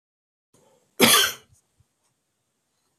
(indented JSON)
{
  "cough_length": "3.0 s",
  "cough_amplitude": 25793,
  "cough_signal_mean_std_ratio": 0.26,
  "survey_phase": "beta (2021-08-13 to 2022-03-07)",
  "age": "45-64",
  "gender": "Male",
  "wearing_mask": "No",
  "symptom_none": true,
  "smoker_status": "Never smoked",
  "respiratory_condition_asthma": false,
  "respiratory_condition_other": false,
  "recruitment_source": "REACT",
  "submission_delay": "1 day",
  "covid_test_result": "Negative",
  "covid_test_method": "RT-qPCR"
}